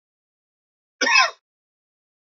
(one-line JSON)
{"cough_length": "2.3 s", "cough_amplitude": 23901, "cough_signal_mean_std_ratio": 0.27, "survey_phase": "beta (2021-08-13 to 2022-03-07)", "age": "45-64", "gender": "Male", "wearing_mask": "No", "symptom_cough_any": true, "symptom_runny_or_blocked_nose": true, "symptom_shortness_of_breath": true, "symptom_sore_throat": true, "symptom_fatigue": true, "smoker_status": "Never smoked", "respiratory_condition_asthma": false, "respiratory_condition_other": false, "recruitment_source": "Test and Trace", "submission_delay": "3 days", "covid_test_result": "Positive", "covid_test_method": "RT-qPCR", "covid_ct_value": 28.2, "covid_ct_gene": "N gene"}